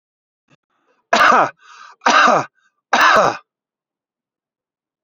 {
  "three_cough_length": "5.0 s",
  "three_cough_amplitude": 30069,
  "three_cough_signal_mean_std_ratio": 0.39,
  "survey_phase": "beta (2021-08-13 to 2022-03-07)",
  "age": "45-64",
  "gender": "Male",
  "wearing_mask": "No",
  "symptom_none": true,
  "smoker_status": "Never smoked",
  "respiratory_condition_asthma": false,
  "respiratory_condition_other": false,
  "recruitment_source": "REACT",
  "submission_delay": "1 day",
  "covid_test_result": "Negative",
  "covid_test_method": "RT-qPCR",
  "influenza_a_test_result": "Unknown/Void",
  "influenza_b_test_result": "Unknown/Void"
}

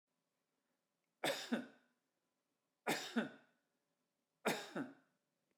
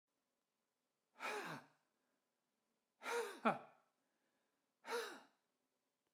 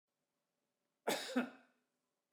{
  "three_cough_length": "5.6 s",
  "three_cough_amplitude": 2807,
  "three_cough_signal_mean_std_ratio": 0.33,
  "exhalation_length": "6.1 s",
  "exhalation_amplitude": 2935,
  "exhalation_signal_mean_std_ratio": 0.31,
  "cough_length": "2.3 s",
  "cough_amplitude": 2519,
  "cough_signal_mean_std_ratio": 0.31,
  "survey_phase": "beta (2021-08-13 to 2022-03-07)",
  "age": "65+",
  "gender": "Male",
  "wearing_mask": "No",
  "symptom_none": true,
  "smoker_status": "Never smoked",
  "respiratory_condition_asthma": false,
  "respiratory_condition_other": false,
  "recruitment_source": "REACT",
  "submission_delay": "5 days",
  "covid_test_result": "Negative",
  "covid_test_method": "RT-qPCR"
}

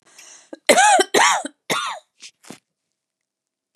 {
  "cough_length": "3.8 s",
  "cough_amplitude": 31902,
  "cough_signal_mean_std_ratio": 0.38,
  "survey_phase": "beta (2021-08-13 to 2022-03-07)",
  "age": "65+",
  "gender": "Female",
  "wearing_mask": "No",
  "symptom_cough_any": true,
  "smoker_status": "Never smoked",
  "respiratory_condition_asthma": false,
  "respiratory_condition_other": false,
  "recruitment_source": "REACT",
  "submission_delay": "1 day",
  "covid_test_result": "Negative",
  "covid_test_method": "RT-qPCR",
  "influenza_a_test_result": "Unknown/Void",
  "influenza_b_test_result": "Unknown/Void"
}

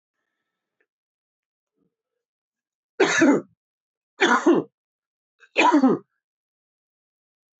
{
  "three_cough_length": "7.6 s",
  "three_cough_amplitude": 18747,
  "three_cough_signal_mean_std_ratio": 0.32,
  "survey_phase": "beta (2021-08-13 to 2022-03-07)",
  "age": "45-64",
  "gender": "Male",
  "wearing_mask": "No",
  "symptom_cough_any": true,
  "symptom_runny_or_blocked_nose": true,
  "symptom_other": true,
  "symptom_onset": "6 days",
  "smoker_status": "Never smoked",
  "respiratory_condition_asthma": false,
  "respiratory_condition_other": false,
  "recruitment_source": "Test and Trace",
  "submission_delay": "2 days",
  "covid_test_result": "Positive",
  "covid_test_method": "RT-qPCR",
  "covid_ct_value": 20.5,
  "covid_ct_gene": "ORF1ab gene"
}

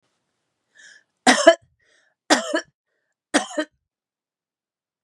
{
  "three_cough_length": "5.0 s",
  "three_cough_amplitude": 32767,
  "three_cough_signal_mean_std_ratio": 0.25,
  "survey_phase": "beta (2021-08-13 to 2022-03-07)",
  "age": "45-64",
  "gender": "Female",
  "wearing_mask": "No",
  "symptom_abdominal_pain": true,
  "symptom_diarrhoea": true,
  "symptom_fatigue": true,
  "symptom_onset": "4 days",
  "smoker_status": "Ex-smoker",
  "respiratory_condition_asthma": true,
  "respiratory_condition_other": false,
  "recruitment_source": "REACT",
  "submission_delay": "2 days",
  "covid_test_result": "Negative",
  "covid_test_method": "RT-qPCR",
  "influenza_a_test_result": "Unknown/Void",
  "influenza_b_test_result": "Unknown/Void"
}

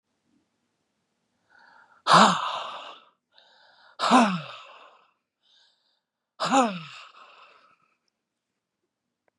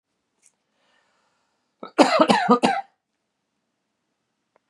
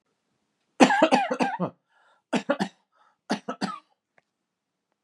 {
  "exhalation_length": "9.4 s",
  "exhalation_amplitude": 19983,
  "exhalation_signal_mean_std_ratio": 0.28,
  "cough_length": "4.7 s",
  "cough_amplitude": 32689,
  "cough_signal_mean_std_ratio": 0.29,
  "three_cough_length": "5.0 s",
  "three_cough_amplitude": 31051,
  "three_cough_signal_mean_std_ratio": 0.34,
  "survey_phase": "beta (2021-08-13 to 2022-03-07)",
  "age": "18-44",
  "gender": "Male",
  "wearing_mask": "No",
  "symptom_none": true,
  "smoker_status": "Ex-smoker",
  "respiratory_condition_asthma": true,
  "respiratory_condition_other": false,
  "recruitment_source": "REACT",
  "submission_delay": "2 days",
  "covid_test_result": "Negative",
  "covid_test_method": "RT-qPCR",
  "influenza_a_test_result": "Negative",
  "influenza_b_test_result": "Negative"
}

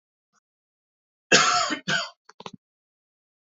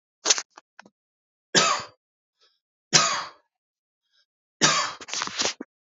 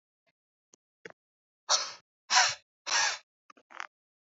{
  "cough_length": "3.5 s",
  "cough_amplitude": 25174,
  "cough_signal_mean_std_ratio": 0.32,
  "three_cough_length": "6.0 s",
  "three_cough_amplitude": 28841,
  "three_cough_signal_mean_std_ratio": 0.35,
  "exhalation_length": "4.3 s",
  "exhalation_amplitude": 10540,
  "exhalation_signal_mean_std_ratio": 0.31,
  "survey_phase": "beta (2021-08-13 to 2022-03-07)",
  "age": "18-44",
  "gender": "Male",
  "wearing_mask": "No",
  "symptom_fatigue": true,
  "smoker_status": "Never smoked",
  "respiratory_condition_asthma": false,
  "respiratory_condition_other": false,
  "recruitment_source": "REACT",
  "submission_delay": "0 days",
  "covid_test_result": "Negative",
  "covid_test_method": "RT-qPCR"
}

